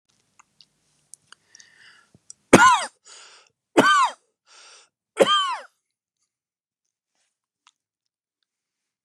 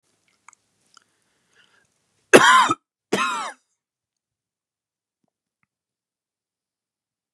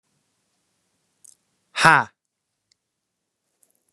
{"three_cough_length": "9.0 s", "three_cough_amplitude": 32768, "three_cough_signal_mean_std_ratio": 0.25, "cough_length": "7.3 s", "cough_amplitude": 32768, "cough_signal_mean_std_ratio": 0.21, "exhalation_length": "3.9 s", "exhalation_amplitude": 32767, "exhalation_signal_mean_std_ratio": 0.16, "survey_phase": "beta (2021-08-13 to 2022-03-07)", "age": "18-44", "gender": "Male", "wearing_mask": "No", "symptom_none": true, "smoker_status": "Never smoked", "respiratory_condition_asthma": false, "respiratory_condition_other": false, "recruitment_source": "REACT", "submission_delay": "1 day", "covid_test_result": "Negative", "covid_test_method": "RT-qPCR", "influenza_a_test_result": "Negative", "influenza_b_test_result": "Negative"}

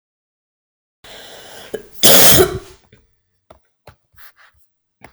{"cough_length": "5.1 s", "cough_amplitude": 32768, "cough_signal_mean_std_ratio": 0.28, "survey_phase": "beta (2021-08-13 to 2022-03-07)", "age": "18-44", "gender": "Female", "wearing_mask": "No", "symptom_fatigue": true, "smoker_status": "Ex-smoker", "respiratory_condition_asthma": false, "respiratory_condition_other": false, "recruitment_source": "REACT", "submission_delay": "0 days", "covid_test_result": "Negative", "covid_test_method": "RT-qPCR"}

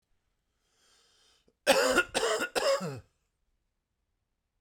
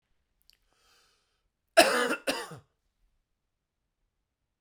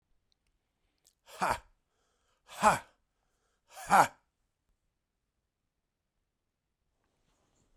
{"three_cough_length": "4.6 s", "three_cough_amplitude": 11509, "three_cough_signal_mean_std_ratio": 0.38, "cough_length": "4.6 s", "cough_amplitude": 21712, "cough_signal_mean_std_ratio": 0.23, "exhalation_length": "7.8 s", "exhalation_amplitude": 14205, "exhalation_signal_mean_std_ratio": 0.19, "survey_phase": "beta (2021-08-13 to 2022-03-07)", "age": "45-64", "gender": "Male", "wearing_mask": "No", "symptom_sore_throat": true, "smoker_status": "Never smoked", "respiratory_condition_asthma": false, "respiratory_condition_other": false, "recruitment_source": "REACT", "submission_delay": "2 days", "covid_test_result": "Negative", "covid_test_method": "RT-qPCR", "influenza_a_test_result": "Negative", "influenza_b_test_result": "Negative"}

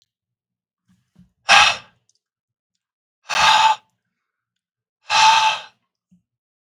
{"exhalation_length": "6.7 s", "exhalation_amplitude": 32768, "exhalation_signal_mean_std_ratio": 0.34, "survey_phase": "beta (2021-08-13 to 2022-03-07)", "age": "18-44", "gender": "Male", "wearing_mask": "No", "symptom_none": true, "symptom_onset": "12 days", "smoker_status": "Current smoker (1 to 10 cigarettes per day)", "respiratory_condition_asthma": false, "respiratory_condition_other": false, "recruitment_source": "REACT", "submission_delay": "1 day", "covid_test_result": "Negative", "covid_test_method": "RT-qPCR"}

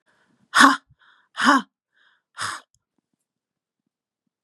{"exhalation_length": "4.4 s", "exhalation_amplitude": 32708, "exhalation_signal_mean_std_ratio": 0.25, "survey_phase": "beta (2021-08-13 to 2022-03-07)", "age": "45-64", "gender": "Female", "wearing_mask": "No", "symptom_cough_any": true, "symptom_runny_or_blocked_nose": true, "symptom_sore_throat": true, "symptom_fatigue": true, "symptom_headache": true, "symptom_onset": "5 days", "smoker_status": "Current smoker (1 to 10 cigarettes per day)", "respiratory_condition_asthma": false, "respiratory_condition_other": false, "recruitment_source": "Test and Trace", "submission_delay": "2 days", "covid_test_result": "Positive", "covid_test_method": "RT-qPCR", "covid_ct_value": 27.2, "covid_ct_gene": "N gene"}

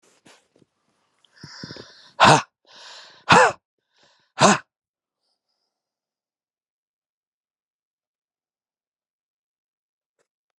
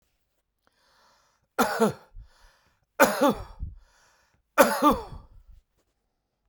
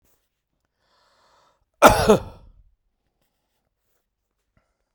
{"exhalation_length": "10.6 s", "exhalation_amplitude": 31023, "exhalation_signal_mean_std_ratio": 0.2, "three_cough_length": "6.5 s", "three_cough_amplitude": 26224, "three_cough_signal_mean_std_ratio": 0.32, "cough_length": "4.9 s", "cough_amplitude": 32768, "cough_signal_mean_std_ratio": 0.2, "survey_phase": "beta (2021-08-13 to 2022-03-07)", "age": "45-64", "gender": "Male", "wearing_mask": "No", "symptom_none": true, "smoker_status": "Current smoker (e-cigarettes or vapes only)", "respiratory_condition_asthma": false, "respiratory_condition_other": false, "recruitment_source": "REACT", "submission_delay": "5 days", "covid_test_result": "Negative", "covid_test_method": "RT-qPCR"}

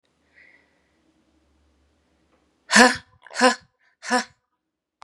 {"exhalation_length": "5.0 s", "exhalation_amplitude": 32767, "exhalation_signal_mean_std_ratio": 0.23, "survey_phase": "beta (2021-08-13 to 2022-03-07)", "age": "45-64", "gender": "Female", "wearing_mask": "Yes", "symptom_sore_throat": true, "symptom_fatigue": true, "symptom_onset": "3 days", "smoker_status": "Never smoked", "respiratory_condition_asthma": false, "respiratory_condition_other": false, "recruitment_source": "Test and Trace", "submission_delay": "1 day", "covid_test_result": "Positive", "covid_test_method": "RT-qPCR", "covid_ct_value": 22.7, "covid_ct_gene": "N gene"}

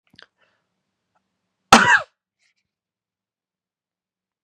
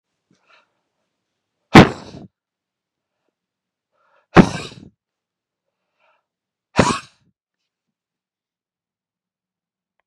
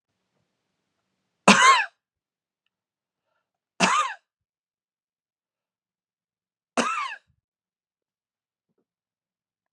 {"cough_length": "4.4 s", "cough_amplitude": 32768, "cough_signal_mean_std_ratio": 0.18, "exhalation_length": "10.1 s", "exhalation_amplitude": 32768, "exhalation_signal_mean_std_ratio": 0.15, "three_cough_length": "9.7 s", "three_cough_amplitude": 32156, "three_cough_signal_mean_std_ratio": 0.22, "survey_phase": "beta (2021-08-13 to 2022-03-07)", "age": "45-64", "gender": "Male", "wearing_mask": "No", "symptom_cough_any": true, "symptom_runny_or_blocked_nose": true, "symptom_sore_throat": true, "symptom_fatigue": true, "smoker_status": "Never smoked", "respiratory_condition_asthma": false, "respiratory_condition_other": false, "recruitment_source": "Test and Trace", "submission_delay": "2 days", "covid_test_result": "Positive", "covid_test_method": "RT-qPCR", "covid_ct_value": 25.6, "covid_ct_gene": "N gene"}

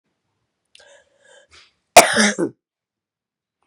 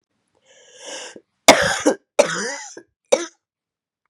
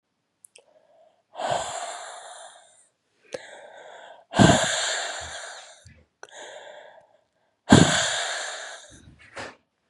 {"cough_length": "3.7 s", "cough_amplitude": 32768, "cough_signal_mean_std_ratio": 0.23, "three_cough_length": "4.1 s", "three_cough_amplitude": 32768, "three_cough_signal_mean_std_ratio": 0.31, "exhalation_length": "9.9 s", "exhalation_amplitude": 31838, "exhalation_signal_mean_std_ratio": 0.34, "survey_phase": "beta (2021-08-13 to 2022-03-07)", "age": "45-64", "gender": "Female", "wearing_mask": "No", "symptom_new_continuous_cough": true, "symptom_runny_or_blocked_nose": true, "symptom_sore_throat": true, "symptom_headache": true, "symptom_change_to_sense_of_smell_or_taste": true, "symptom_onset": "3 days", "smoker_status": "Never smoked", "respiratory_condition_asthma": false, "respiratory_condition_other": false, "recruitment_source": "Test and Trace", "submission_delay": "2 days", "covid_test_result": "Positive", "covid_test_method": "RT-qPCR", "covid_ct_value": 22.2, "covid_ct_gene": "N gene"}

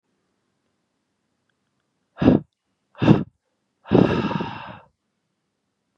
{"exhalation_length": "6.0 s", "exhalation_amplitude": 32738, "exhalation_signal_mean_std_ratio": 0.29, "survey_phase": "beta (2021-08-13 to 2022-03-07)", "age": "18-44", "gender": "Male", "wearing_mask": "No", "symptom_runny_or_blocked_nose": true, "symptom_fatigue": true, "symptom_headache": true, "symptom_change_to_sense_of_smell_or_taste": true, "symptom_loss_of_taste": true, "symptom_other": true, "symptom_onset": "4 days", "smoker_status": "Never smoked", "respiratory_condition_asthma": false, "respiratory_condition_other": false, "recruitment_source": "Test and Trace", "submission_delay": "1 day", "covid_test_result": "Positive", "covid_test_method": "RT-qPCR", "covid_ct_value": 27.4, "covid_ct_gene": "N gene"}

